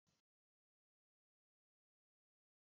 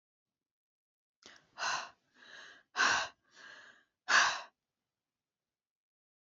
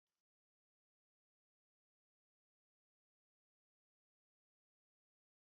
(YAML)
cough_length: 2.7 s
cough_amplitude: 10
cough_signal_mean_std_ratio: 0.15
exhalation_length: 6.2 s
exhalation_amplitude: 8062
exhalation_signal_mean_std_ratio: 0.29
three_cough_length: 5.5 s
three_cough_amplitude: 3
three_cough_signal_mean_std_ratio: 0.06
survey_phase: beta (2021-08-13 to 2022-03-07)
age: 45-64
gender: Female
wearing_mask: 'No'
symptom_none: true
smoker_status: Never smoked
respiratory_condition_asthma: false
respiratory_condition_other: false
recruitment_source: Test and Trace
submission_delay: 1 day
covid_test_result: Negative
covid_test_method: ePCR